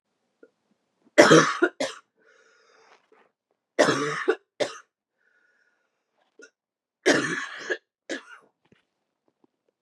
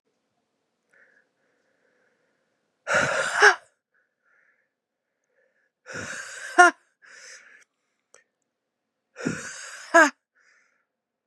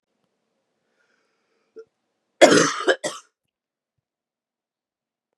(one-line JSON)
{"three_cough_length": "9.8 s", "three_cough_amplitude": 32558, "three_cough_signal_mean_std_ratio": 0.28, "exhalation_length": "11.3 s", "exhalation_amplitude": 31311, "exhalation_signal_mean_std_ratio": 0.24, "cough_length": "5.4 s", "cough_amplitude": 32767, "cough_signal_mean_std_ratio": 0.22, "survey_phase": "beta (2021-08-13 to 2022-03-07)", "age": "18-44", "gender": "Female", "wearing_mask": "No", "symptom_diarrhoea": true, "symptom_change_to_sense_of_smell_or_taste": true, "symptom_other": true, "symptom_onset": "3 days", "smoker_status": "Ex-smoker", "respiratory_condition_asthma": false, "respiratory_condition_other": false, "recruitment_source": "Test and Trace", "submission_delay": "1 day", "covid_test_result": "Positive", "covid_test_method": "RT-qPCR", "covid_ct_value": 16.6, "covid_ct_gene": "ORF1ab gene"}